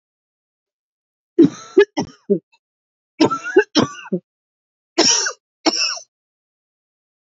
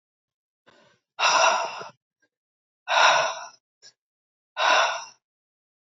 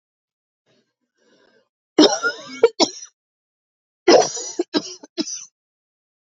{
  "three_cough_length": "7.3 s",
  "three_cough_amplitude": 28073,
  "three_cough_signal_mean_std_ratio": 0.33,
  "exhalation_length": "5.8 s",
  "exhalation_amplitude": 19033,
  "exhalation_signal_mean_std_ratio": 0.4,
  "cough_length": "6.4 s",
  "cough_amplitude": 32153,
  "cough_signal_mean_std_ratio": 0.29,
  "survey_phase": "alpha (2021-03-01 to 2021-08-12)",
  "age": "45-64",
  "gender": "Female",
  "wearing_mask": "No",
  "symptom_abdominal_pain": true,
  "symptom_diarrhoea": true,
  "symptom_fatigue": true,
  "symptom_fever_high_temperature": true,
  "symptom_headache": true,
  "symptom_change_to_sense_of_smell_or_taste": true,
  "symptom_loss_of_taste": true,
  "smoker_status": "Never smoked",
  "respiratory_condition_asthma": false,
  "respiratory_condition_other": false,
  "recruitment_source": "Test and Trace",
  "submission_delay": "1 day",
  "covid_test_result": "Positive",
  "covid_test_method": "LFT"
}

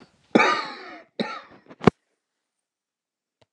{
  "cough_length": "3.5 s",
  "cough_amplitude": 29204,
  "cough_signal_mean_std_ratio": 0.25,
  "survey_phase": "alpha (2021-03-01 to 2021-08-12)",
  "age": "65+",
  "gender": "Male",
  "wearing_mask": "No",
  "symptom_shortness_of_breath": true,
  "smoker_status": "Never smoked",
  "respiratory_condition_asthma": true,
  "respiratory_condition_other": true,
  "recruitment_source": "REACT",
  "submission_delay": "1 day",
  "covid_test_result": "Negative",
  "covid_test_method": "RT-qPCR"
}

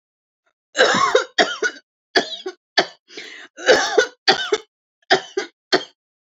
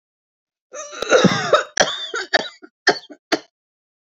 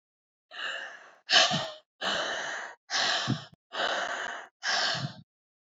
{
  "three_cough_length": "6.4 s",
  "three_cough_amplitude": 29643,
  "three_cough_signal_mean_std_ratio": 0.42,
  "cough_length": "4.1 s",
  "cough_amplitude": 28841,
  "cough_signal_mean_std_ratio": 0.4,
  "exhalation_length": "5.6 s",
  "exhalation_amplitude": 17038,
  "exhalation_signal_mean_std_ratio": 0.58,
  "survey_phase": "beta (2021-08-13 to 2022-03-07)",
  "age": "45-64",
  "gender": "Female",
  "wearing_mask": "No",
  "symptom_none": true,
  "smoker_status": "Never smoked",
  "respiratory_condition_asthma": false,
  "respiratory_condition_other": false,
  "recruitment_source": "REACT",
  "submission_delay": "3 days",
  "covid_test_result": "Negative",
  "covid_test_method": "RT-qPCR",
  "influenza_a_test_result": "Negative",
  "influenza_b_test_result": "Negative"
}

